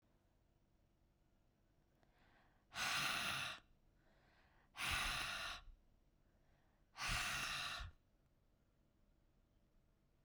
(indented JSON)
{
  "exhalation_length": "10.2 s",
  "exhalation_amplitude": 1407,
  "exhalation_signal_mean_std_ratio": 0.45,
  "survey_phase": "beta (2021-08-13 to 2022-03-07)",
  "age": "18-44",
  "gender": "Female",
  "wearing_mask": "No",
  "symptom_cough_any": true,
  "symptom_sore_throat": true,
  "symptom_headache": true,
  "symptom_change_to_sense_of_smell_or_taste": true,
  "symptom_loss_of_taste": true,
  "symptom_onset": "9 days",
  "smoker_status": "Current smoker (e-cigarettes or vapes only)",
  "respiratory_condition_asthma": false,
  "respiratory_condition_other": false,
  "recruitment_source": "Test and Trace",
  "submission_delay": "2 days",
  "covid_test_result": "Positive",
  "covid_test_method": "RT-qPCR",
  "covid_ct_value": 15.6,
  "covid_ct_gene": "ORF1ab gene",
  "covid_ct_mean": 16.1,
  "covid_viral_load": "5300000 copies/ml",
  "covid_viral_load_category": "High viral load (>1M copies/ml)"
}